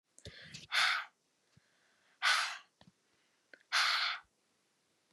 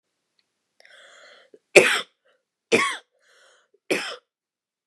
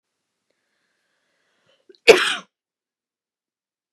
{"exhalation_length": "5.1 s", "exhalation_amplitude": 4964, "exhalation_signal_mean_std_ratio": 0.39, "three_cough_length": "4.9 s", "three_cough_amplitude": 32768, "three_cough_signal_mean_std_ratio": 0.24, "cough_length": "3.9 s", "cough_amplitude": 32768, "cough_signal_mean_std_ratio": 0.16, "survey_phase": "beta (2021-08-13 to 2022-03-07)", "age": "18-44", "gender": "Female", "wearing_mask": "No", "symptom_none": true, "smoker_status": "Never smoked", "respiratory_condition_asthma": false, "respiratory_condition_other": false, "recruitment_source": "REACT", "submission_delay": "1 day", "covid_test_result": "Negative", "covid_test_method": "RT-qPCR", "influenza_a_test_result": "Negative", "influenza_b_test_result": "Negative"}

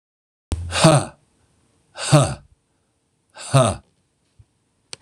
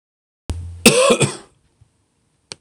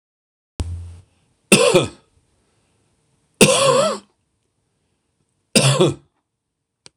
{"exhalation_length": "5.0 s", "exhalation_amplitude": 26027, "exhalation_signal_mean_std_ratio": 0.33, "cough_length": "2.6 s", "cough_amplitude": 26028, "cough_signal_mean_std_ratio": 0.36, "three_cough_length": "7.0 s", "three_cough_amplitude": 26028, "three_cough_signal_mean_std_ratio": 0.36, "survey_phase": "beta (2021-08-13 to 2022-03-07)", "age": "45-64", "gender": "Male", "wearing_mask": "No", "symptom_cough_any": true, "symptom_sore_throat": true, "symptom_onset": "2 days", "smoker_status": "Never smoked", "respiratory_condition_asthma": true, "respiratory_condition_other": false, "recruitment_source": "REACT", "submission_delay": "1 day", "covid_test_result": "Negative", "covid_test_method": "RT-qPCR", "influenza_a_test_result": "Unknown/Void", "influenza_b_test_result": "Unknown/Void"}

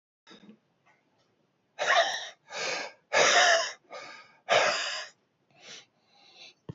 {"exhalation_length": "6.7 s", "exhalation_amplitude": 10900, "exhalation_signal_mean_std_ratio": 0.42, "survey_phase": "beta (2021-08-13 to 2022-03-07)", "age": "65+", "gender": "Male", "wearing_mask": "No", "symptom_none": true, "smoker_status": "Ex-smoker", "respiratory_condition_asthma": false, "respiratory_condition_other": false, "recruitment_source": "REACT", "submission_delay": "2 days", "covid_test_result": "Negative", "covid_test_method": "RT-qPCR", "influenza_a_test_result": "Negative", "influenza_b_test_result": "Negative"}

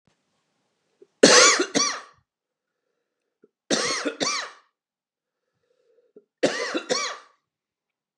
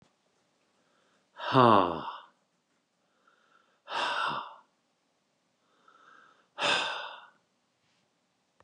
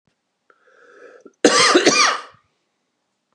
{"three_cough_length": "8.2 s", "three_cough_amplitude": 30596, "three_cough_signal_mean_std_ratio": 0.32, "exhalation_length": "8.6 s", "exhalation_amplitude": 14961, "exhalation_signal_mean_std_ratio": 0.29, "cough_length": "3.3 s", "cough_amplitude": 31999, "cough_signal_mean_std_ratio": 0.38, "survey_phase": "beta (2021-08-13 to 2022-03-07)", "age": "45-64", "gender": "Male", "wearing_mask": "No", "symptom_cough_any": true, "symptom_runny_or_blocked_nose": true, "symptom_fatigue": true, "smoker_status": "Ex-smoker", "respiratory_condition_asthma": false, "respiratory_condition_other": false, "recruitment_source": "REACT", "submission_delay": "6 days", "covid_test_result": "Negative", "covid_test_method": "RT-qPCR", "influenza_a_test_result": "Negative", "influenza_b_test_result": "Negative"}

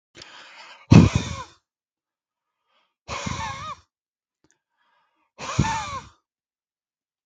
{"exhalation_length": "7.3 s", "exhalation_amplitude": 32768, "exhalation_signal_mean_std_ratio": 0.24, "survey_phase": "beta (2021-08-13 to 2022-03-07)", "age": "45-64", "gender": "Male", "wearing_mask": "No", "symptom_none": true, "smoker_status": "Never smoked", "respiratory_condition_asthma": false, "respiratory_condition_other": false, "recruitment_source": "REACT", "submission_delay": "2 days", "covid_test_result": "Negative", "covid_test_method": "RT-qPCR", "influenza_a_test_result": "Negative", "influenza_b_test_result": "Negative"}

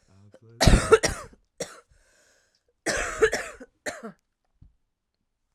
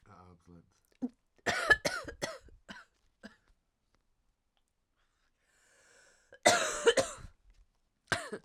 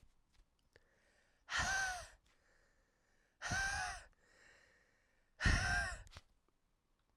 {"three_cough_length": "5.5 s", "three_cough_amplitude": 29584, "three_cough_signal_mean_std_ratio": 0.3, "cough_length": "8.4 s", "cough_amplitude": 12512, "cough_signal_mean_std_ratio": 0.29, "exhalation_length": "7.2 s", "exhalation_amplitude": 3243, "exhalation_signal_mean_std_ratio": 0.4, "survey_phase": "alpha (2021-03-01 to 2021-08-12)", "age": "18-44", "gender": "Female", "wearing_mask": "No", "symptom_cough_any": true, "symptom_shortness_of_breath": true, "symptom_diarrhoea": true, "symptom_fatigue": true, "symptom_change_to_sense_of_smell_or_taste": true, "symptom_loss_of_taste": true, "symptom_onset": "3 days", "smoker_status": "Current smoker (1 to 10 cigarettes per day)", "respiratory_condition_asthma": false, "respiratory_condition_other": false, "recruitment_source": "Test and Trace", "submission_delay": "1 day", "covid_test_result": "Positive", "covid_test_method": "RT-qPCR"}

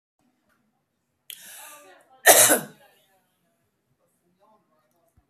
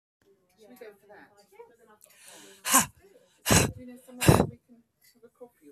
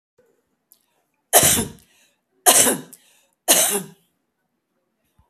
{"cough_length": "5.3 s", "cough_amplitude": 32768, "cough_signal_mean_std_ratio": 0.21, "exhalation_length": "5.7 s", "exhalation_amplitude": 19087, "exhalation_signal_mean_std_ratio": 0.28, "three_cough_length": "5.3 s", "three_cough_amplitude": 32768, "three_cough_signal_mean_std_ratio": 0.33, "survey_phase": "beta (2021-08-13 to 2022-03-07)", "age": "65+", "gender": "Female", "wearing_mask": "Yes", "symptom_none": true, "smoker_status": "Never smoked", "respiratory_condition_asthma": false, "respiratory_condition_other": false, "recruitment_source": "REACT", "submission_delay": "3 days", "covid_test_result": "Negative", "covid_test_method": "RT-qPCR", "influenza_a_test_result": "Negative", "influenza_b_test_result": "Negative"}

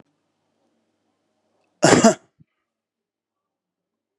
{"cough_length": "4.2 s", "cough_amplitude": 32767, "cough_signal_mean_std_ratio": 0.2, "survey_phase": "beta (2021-08-13 to 2022-03-07)", "age": "45-64", "gender": "Male", "wearing_mask": "No", "symptom_none": true, "smoker_status": "Never smoked", "respiratory_condition_asthma": false, "respiratory_condition_other": false, "recruitment_source": "REACT", "submission_delay": "2 days", "covid_test_result": "Negative", "covid_test_method": "RT-qPCR", "influenza_a_test_result": "Negative", "influenza_b_test_result": "Negative"}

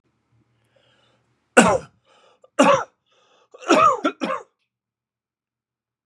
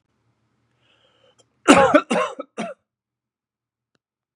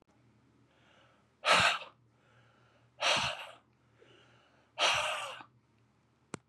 {"three_cough_length": "6.1 s", "three_cough_amplitude": 32768, "three_cough_signal_mean_std_ratio": 0.31, "cough_length": "4.4 s", "cough_amplitude": 32768, "cough_signal_mean_std_ratio": 0.27, "exhalation_length": "6.5 s", "exhalation_amplitude": 8344, "exhalation_signal_mean_std_ratio": 0.35, "survey_phase": "beta (2021-08-13 to 2022-03-07)", "age": "45-64", "gender": "Male", "wearing_mask": "No", "symptom_cough_any": true, "symptom_runny_or_blocked_nose": true, "symptom_sore_throat": true, "symptom_fatigue": true, "symptom_headache": true, "symptom_onset": "4 days", "smoker_status": "Ex-smoker", "respiratory_condition_asthma": false, "respiratory_condition_other": false, "recruitment_source": "Test and Trace", "submission_delay": "1 day", "covid_test_result": "Positive", "covid_test_method": "ePCR"}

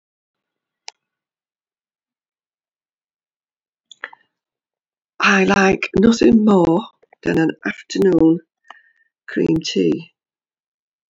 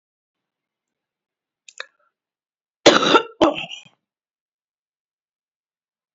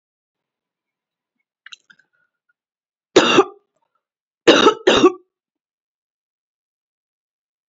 {"exhalation_length": "11.1 s", "exhalation_amplitude": 26335, "exhalation_signal_mean_std_ratio": 0.41, "cough_length": "6.1 s", "cough_amplitude": 32767, "cough_signal_mean_std_ratio": 0.22, "three_cough_length": "7.7 s", "three_cough_amplitude": 32767, "three_cough_signal_mean_std_ratio": 0.25, "survey_phase": "beta (2021-08-13 to 2022-03-07)", "age": "45-64", "gender": "Female", "wearing_mask": "No", "symptom_cough_any": true, "symptom_new_continuous_cough": true, "symptom_runny_or_blocked_nose": true, "symptom_shortness_of_breath": true, "symptom_sore_throat": true, "symptom_abdominal_pain": true, "symptom_fatigue": true, "symptom_fever_high_temperature": true, "symptom_headache": true, "symptom_change_to_sense_of_smell_or_taste": true, "symptom_loss_of_taste": true, "symptom_onset": "4 days", "smoker_status": "Never smoked", "respiratory_condition_asthma": false, "respiratory_condition_other": false, "recruitment_source": "Test and Trace", "submission_delay": "1 day", "covid_test_result": "Positive", "covid_test_method": "RT-qPCR", "covid_ct_value": 14.4, "covid_ct_gene": "S gene", "covid_ct_mean": 14.6, "covid_viral_load": "16000000 copies/ml", "covid_viral_load_category": "High viral load (>1M copies/ml)"}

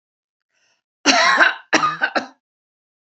{"cough_length": "3.1 s", "cough_amplitude": 32767, "cough_signal_mean_std_ratio": 0.42, "survey_phase": "beta (2021-08-13 to 2022-03-07)", "age": "45-64", "gender": "Female", "wearing_mask": "No", "symptom_none": true, "smoker_status": "Never smoked", "respiratory_condition_asthma": false, "respiratory_condition_other": false, "recruitment_source": "REACT", "submission_delay": "2 days", "covid_test_result": "Negative", "covid_test_method": "RT-qPCR", "influenza_a_test_result": "Negative", "influenza_b_test_result": "Negative"}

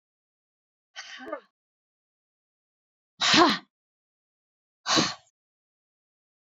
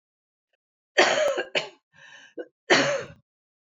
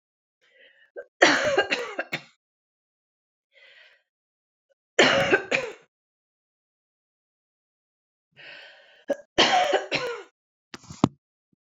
{"exhalation_length": "6.5 s", "exhalation_amplitude": 16642, "exhalation_signal_mean_std_ratio": 0.25, "cough_length": "3.7 s", "cough_amplitude": 23263, "cough_signal_mean_std_ratio": 0.4, "three_cough_length": "11.7 s", "three_cough_amplitude": 25600, "three_cough_signal_mean_std_ratio": 0.32, "survey_phase": "beta (2021-08-13 to 2022-03-07)", "age": "65+", "gender": "Female", "wearing_mask": "No", "symptom_cough_any": true, "symptom_runny_or_blocked_nose": true, "symptom_onset": "6 days", "smoker_status": "Ex-smoker", "respiratory_condition_asthma": true, "respiratory_condition_other": false, "recruitment_source": "Test and Trace", "submission_delay": "2 days", "covid_test_result": "Positive", "covid_test_method": "RT-qPCR", "covid_ct_value": 15.1, "covid_ct_gene": "ORF1ab gene", "covid_ct_mean": 16.1, "covid_viral_load": "5400000 copies/ml", "covid_viral_load_category": "High viral load (>1M copies/ml)"}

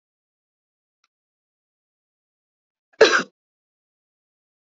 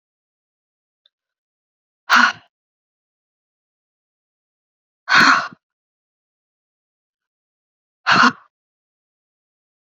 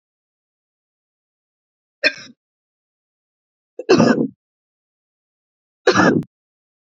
{"cough_length": "4.8 s", "cough_amplitude": 28430, "cough_signal_mean_std_ratio": 0.15, "exhalation_length": "9.9 s", "exhalation_amplitude": 32768, "exhalation_signal_mean_std_ratio": 0.23, "three_cough_length": "7.0 s", "three_cough_amplitude": 28417, "three_cough_signal_mean_std_ratio": 0.26, "survey_phase": "beta (2021-08-13 to 2022-03-07)", "age": "18-44", "gender": "Female", "wearing_mask": "No", "symptom_runny_or_blocked_nose": true, "symptom_sore_throat": true, "symptom_abdominal_pain": true, "symptom_fatigue": true, "symptom_fever_high_temperature": true, "symptom_headache": true, "symptom_onset": "2 days", "smoker_status": "Never smoked", "respiratory_condition_asthma": false, "respiratory_condition_other": false, "recruitment_source": "Test and Trace", "submission_delay": "1 day", "covid_test_result": "Positive", "covid_test_method": "RT-qPCR", "covid_ct_value": 24.9, "covid_ct_gene": "ORF1ab gene", "covid_ct_mean": 25.4, "covid_viral_load": "4500 copies/ml", "covid_viral_load_category": "Minimal viral load (< 10K copies/ml)"}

